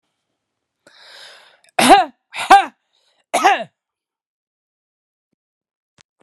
{
  "three_cough_length": "6.2 s",
  "three_cough_amplitude": 32768,
  "three_cough_signal_mean_std_ratio": 0.26,
  "survey_phase": "beta (2021-08-13 to 2022-03-07)",
  "age": "45-64",
  "gender": "Male",
  "wearing_mask": "No",
  "symptom_cough_any": true,
  "symptom_fatigue": true,
  "symptom_fever_high_temperature": true,
  "symptom_headache": true,
  "symptom_change_to_sense_of_smell_or_taste": true,
  "symptom_loss_of_taste": true,
  "symptom_onset": "2 days",
  "smoker_status": "Never smoked",
  "respiratory_condition_asthma": false,
  "respiratory_condition_other": false,
  "recruitment_source": "Test and Trace",
  "submission_delay": "2 days",
  "covid_test_result": "Positive",
  "covid_test_method": "RT-qPCR"
}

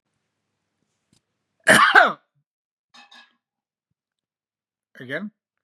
{
  "cough_length": "5.6 s",
  "cough_amplitude": 32625,
  "cough_signal_mean_std_ratio": 0.23,
  "survey_phase": "beta (2021-08-13 to 2022-03-07)",
  "age": "65+",
  "gender": "Male",
  "wearing_mask": "No",
  "symptom_none": true,
  "smoker_status": "Ex-smoker",
  "respiratory_condition_asthma": false,
  "respiratory_condition_other": false,
  "recruitment_source": "REACT",
  "submission_delay": "5 days",
  "covid_test_result": "Negative",
  "covid_test_method": "RT-qPCR"
}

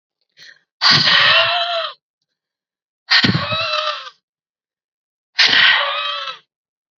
{
  "exhalation_length": "7.0 s",
  "exhalation_amplitude": 32768,
  "exhalation_signal_mean_std_ratio": 0.51,
  "survey_phase": "alpha (2021-03-01 to 2021-08-12)",
  "age": "18-44",
  "gender": "Female",
  "wearing_mask": "No",
  "symptom_fatigue": true,
  "symptom_fever_high_temperature": true,
  "symptom_headache": true,
  "smoker_status": "Never smoked",
  "respiratory_condition_asthma": false,
  "respiratory_condition_other": false,
  "recruitment_source": "Test and Trace",
  "submission_delay": "1 day",
  "covid_test_result": "Positive",
  "covid_test_method": "RT-qPCR",
  "covid_ct_value": 14.4,
  "covid_ct_gene": "ORF1ab gene",
  "covid_ct_mean": 14.6,
  "covid_viral_load": "16000000 copies/ml",
  "covid_viral_load_category": "High viral load (>1M copies/ml)"
}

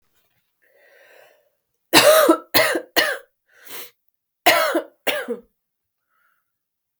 {
  "cough_length": "7.0 s",
  "cough_amplitude": 32768,
  "cough_signal_mean_std_ratio": 0.36,
  "survey_phase": "beta (2021-08-13 to 2022-03-07)",
  "age": "18-44",
  "gender": "Female",
  "wearing_mask": "No",
  "symptom_cough_any": true,
  "symptom_runny_or_blocked_nose": true,
  "symptom_sore_throat": true,
  "symptom_headache": true,
  "symptom_change_to_sense_of_smell_or_taste": true,
  "symptom_onset": "3 days",
  "smoker_status": "Never smoked",
  "respiratory_condition_asthma": false,
  "respiratory_condition_other": false,
  "recruitment_source": "Test and Trace",
  "submission_delay": "1 day",
  "covid_test_result": "Positive",
  "covid_test_method": "RT-qPCR",
  "covid_ct_value": 20.2,
  "covid_ct_gene": "ORF1ab gene",
  "covid_ct_mean": 20.3,
  "covid_viral_load": "220000 copies/ml",
  "covid_viral_load_category": "Low viral load (10K-1M copies/ml)"
}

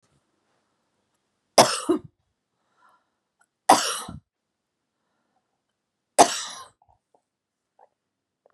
{
  "three_cough_length": "8.5 s",
  "three_cough_amplitude": 32493,
  "three_cough_signal_mean_std_ratio": 0.2,
  "survey_phase": "beta (2021-08-13 to 2022-03-07)",
  "age": "45-64",
  "gender": "Female",
  "wearing_mask": "No",
  "symptom_sore_throat": true,
  "symptom_fatigue": true,
  "symptom_onset": "12 days",
  "smoker_status": "Ex-smoker",
  "respiratory_condition_asthma": true,
  "respiratory_condition_other": false,
  "recruitment_source": "REACT",
  "submission_delay": "1 day",
  "covid_test_result": "Negative",
  "covid_test_method": "RT-qPCR",
  "influenza_a_test_result": "Negative",
  "influenza_b_test_result": "Negative"
}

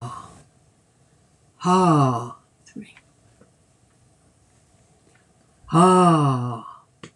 {
  "exhalation_length": "7.2 s",
  "exhalation_amplitude": 23172,
  "exhalation_signal_mean_std_ratio": 0.39,
  "survey_phase": "beta (2021-08-13 to 2022-03-07)",
  "age": "65+",
  "gender": "Female",
  "wearing_mask": "No",
  "symptom_none": true,
  "smoker_status": "Ex-smoker",
  "respiratory_condition_asthma": false,
  "respiratory_condition_other": false,
  "recruitment_source": "REACT",
  "submission_delay": "3 days",
  "covid_test_result": "Negative",
  "covid_test_method": "RT-qPCR"
}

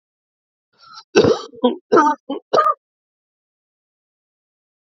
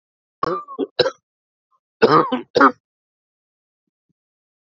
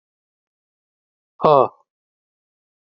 {
  "three_cough_length": "4.9 s",
  "three_cough_amplitude": 29199,
  "three_cough_signal_mean_std_ratio": 0.33,
  "cough_length": "4.7 s",
  "cough_amplitude": 29408,
  "cough_signal_mean_std_ratio": 0.3,
  "exhalation_length": "3.0 s",
  "exhalation_amplitude": 27566,
  "exhalation_signal_mean_std_ratio": 0.19,
  "survey_phase": "beta (2021-08-13 to 2022-03-07)",
  "age": "45-64",
  "gender": "Male",
  "wearing_mask": "No",
  "symptom_none": true,
  "symptom_onset": "4 days",
  "smoker_status": "Never smoked",
  "respiratory_condition_asthma": false,
  "respiratory_condition_other": false,
  "recruitment_source": "Test and Trace",
  "submission_delay": "2 days",
  "covid_test_result": "Positive",
  "covid_test_method": "RT-qPCR",
  "covid_ct_value": 19.5,
  "covid_ct_gene": "N gene"
}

